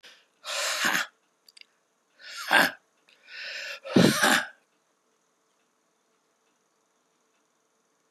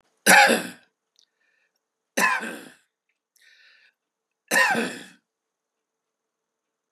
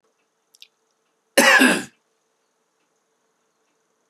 {
  "exhalation_length": "8.1 s",
  "exhalation_amplitude": 25971,
  "exhalation_signal_mean_std_ratio": 0.32,
  "three_cough_length": "6.9 s",
  "three_cough_amplitude": 26600,
  "three_cough_signal_mean_std_ratio": 0.29,
  "cough_length": "4.1 s",
  "cough_amplitude": 30840,
  "cough_signal_mean_std_ratio": 0.26,
  "survey_phase": "beta (2021-08-13 to 2022-03-07)",
  "age": "45-64",
  "gender": "Male",
  "wearing_mask": "No",
  "symptom_runny_or_blocked_nose": true,
  "symptom_sore_throat": true,
  "smoker_status": "Never smoked",
  "respiratory_condition_asthma": false,
  "respiratory_condition_other": false,
  "recruitment_source": "Test and Trace",
  "submission_delay": "1 day",
  "covid_test_result": "Positive",
  "covid_test_method": "LFT"
}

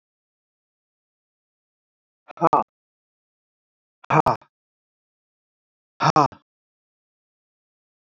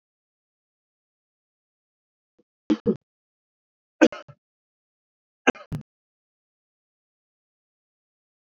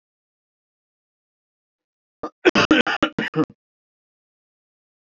{
  "exhalation_length": "8.2 s",
  "exhalation_amplitude": 26456,
  "exhalation_signal_mean_std_ratio": 0.19,
  "three_cough_length": "8.5 s",
  "three_cough_amplitude": 25419,
  "three_cough_signal_mean_std_ratio": 0.13,
  "cough_length": "5.0 s",
  "cough_amplitude": 26514,
  "cough_signal_mean_std_ratio": 0.25,
  "survey_phase": "alpha (2021-03-01 to 2021-08-12)",
  "age": "45-64",
  "gender": "Male",
  "wearing_mask": "No",
  "symptom_none": true,
  "smoker_status": "Ex-smoker",
  "respiratory_condition_asthma": false,
  "respiratory_condition_other": false,
  "recruitment_source": "REACT",
  "submission_delay": "1 day",
  "covid_test_result": "Negative",
  "covid_test_method": "RT-qPCR"
}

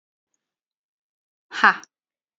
{
  "exhalation_length": "2.4 s",
  "exhalation_amplitude": 27625,
  "exhalation_signal_mean_std_ratio": 0.17,
  "survey_phase": "beta (2021-08-13 to 2022-03-07)",
  "age": "18-44",
  "gender": "Female",
  "wearing_mask": "No",
  "symptom_none": true,
  "smoker_status": "Ex-smoker",
  "respiratory_condition_asthma": false,
  "respiratory_condition_other": false,
  "recruitment_source": "REACT",
  "submission_delay": "2 days",
  "covid_test_result": "Negative",
  "covid_test_method": "RT-qPCR"
}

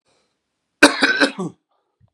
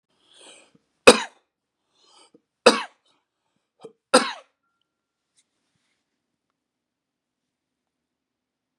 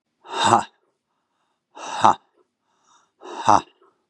{
  "cough_length": "2.1 s",
  "cough_amplitude": 32768,
  "cough_signal_mean_std_ratio": 0.33,
  "three_cough_length": "8.8 s",
  "three_cough_amplitude": 32768,
  "three_cough_signal_mean_std_ratio": 0.14,
  "exhalation_length": "4.1 s",
  "exhalation_amplitude": 32768,
  "exhalation_signal_mean_std_ratio": 0.29,
  "survey_phase": "beta (2021-08-13 to 2022-03-07)",
  "age": "45-64",
  "gender": "Male",
  "wearing_mask": "No",
  "symptom_none": true,
  "smoker_status": "Never smoked",
  "respiratory_condition_asthma": true,
  "respiratory_condition_other": false,
  "recruitment_source": "REACT",
  "submission_delay": "1 day",
  "covid_test_result": "Negative",
  "covid_test_method": "RT-qPCR",
  "influenza_a_test_result": "Negative",
  "influenza_b_test_result": "Negative"
}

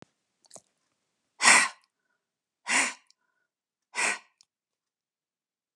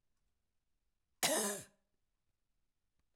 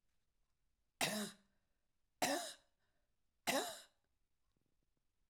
{
  "exhalation_length": "5.8 s",
  "exhalation_amplitude": 20168,
  "exhalation_signal_mean_std_ratio": 0.25,
  "cough_length": "3.2 s",
  "cough_amplitude": 4555,
  "cough_signal_mean_std_ratio": 0.27,
  "three_cough_length": "5.3 s",
  "three_cough_amplitude": 2295,
  "three_cough_signal_mean_std_ratio": 0.32,
  "survey_phase": "alpha (2021-03-01 to 2021-08-12)",
  "age": "65+",
  "gender": "Female",
  "wearing_mask": "No",
  "symptom_none": true,
  "smoker_status": "Never smoked",
  "respiratory_condition_asthma": false,
  "respiratory_condition_other": false,
  "recruitment_source": "REACT",
  "submission_delay": "2 days",
  "covid_test_result": "Negative",
  "covid_test_method": "RT-qPCR",
  "covid_ct_value": 41.0,
  "covid_ct_gene": "N gene"
}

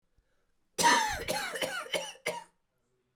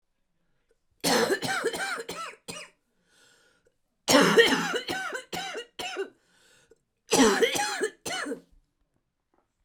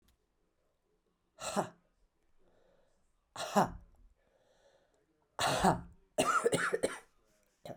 {
  "cough_length": "3.2 s",
  "cough_amplitude": 7963,
  "cough_signal_mean_std_ratio": 0.47,
  "three_cough_length": "9.6 s",
  "three_cough_amplitude": 18284,
  "three_cough_signal_mean_std_ratio": 0.45,
  "exhalation_length": "7.8 s",
  "exhalation_amplitude": 6896,
  "exhalation_signal_mean_std_ratio": 0.35,
  "survey_phase": "beta (2021-08-13 to 2022-03-07)",
  "age": "45-64",
  "gender": "Female",
  "wearing_mask": "No",
  "symptom_cough_any": true,
  "symptom_runny_or_blocked_nose": true,
  "symptom_sore_throat": true,
  "symptom_diarrhoea": true,
  "symptom_fatigue": true,
  "symptom_headache": true,
  "symptom_change_to_sense_of_smell_or_taste": true,
  "symptom_loss_of_taste": true,
  "symptom_onset": "2 days",
  "smoker_status": "Never smoked",
  "respiratory_condition_asthma": false,
  "respiratory_condition_other": false,
  "recruitment_source": "Test and Trace",
  "submission_delay": "2 days",
  "covid_test_result": "Positive",
  "covid_test_method": "RT-qPCR",
  "covid_ct_value": 26.3,
  "covid_ct_gene": "ORF1ab gene"
}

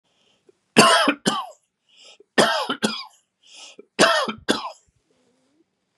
{
  "three_cough_length": "6.0 s",
  "three_cough_amplitude": 32768,
  "three_cough_signal_mean_std_ratio": 0.38,
  "survey_phase": "beta (2021-08-13 to 2022-03-07)",
  "age": "65+",
  "gender": "Male",
  "wearing_mask": "No",
  "symptom_none": true,
  "smoker_status": "Ex-smoker",
  "respiratory_condition_asthma": false,
  "respiratory_condition_other": false,
  "recruitment_source": "REACT",
  "submission_delay": "2 days",
  "covid_test_result": "Negative",
  "covid_test_method": "RT-qPCR",
  "influenza_a_test_result": "Negative",
  "influenza_b_test_result": "Negative"
}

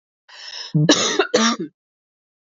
{
  "cough_length": "2.5 s",
  "cough_amplitude": 28862,
  "cough_signal_mean_std_ratio": 0.48,
  "survey_phase": "beta (2021-08-13 to 2022-03-07)",
  "age": "18-44",
  "gender": "Female",
  "wearing_mask": "Yes",
  "symptom_none": true,
  "smoker_status": "Ex-smoker",
  "respiratory_condition_asthma": true,
  "respiratory_condition_other": false,
  "recruitment_source": "REACT",
  "submission_delay": "1 day",
  "covid_test_result": "Negative",
  "covid_test_method": "RT-qPCR"
}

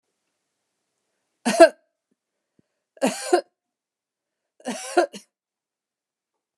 {
  "exhalation_length": "6.6 s",
  "exhalation_amplitude": 29203,
  "exhalation_signal_mean_std_ratio": 0.21,
  "survey_phase": "beta (2021-08-13 to 2022-03-07)",
  "age": "65+",
  "gender": "Female",
  "wearing_mask": "No",
  "symptom_none": true,
  "smoker_status": "Never smoked",
  "respiratory_condition_asthma": false,
  "respiratory_condition_other": false,
  "recruitment_source": "REACT",
  "submission_delay": "1 day",
  "covid_test_result": "Negative",
  "covid_test_method": "RT-qPCR"
}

